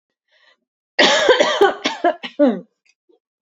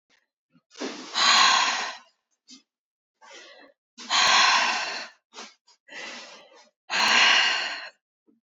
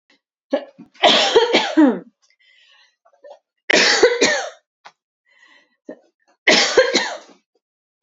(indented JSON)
{
  "cough_length": "3.4 s",
  "cough_amplitude": 31155,
  "cough_signal_mean_std_ratio": 0.47,
  "exhalation_length": "8.5 s",
  "exhalation_amplitude": 17931,
  "exhalation_signal_mean_std_ratio": 0.47,
  "three_cough_length": "8.0 s",
  "three_cough_amplitude": 31777,
  "three_cough_signal_mean_std_ratio": 0.43,
  "survey_phase": "alpha (2021-03-01 to 2021-08-12)",
  "age": "18-44",
  "gender": "Female",
  "wearing_mask": "No",
  "symptom_none": true,
  "smoker_status": "Never smoked",
  "respiratory_condition_asthma": false,
  "respiratory_condition_other": false,
  "recruitment_source": "REACT",
  "submission_delay": "2 days",
  "covid_test_result": "Negative",
  "covid_test_method": "RT-qPCR"
}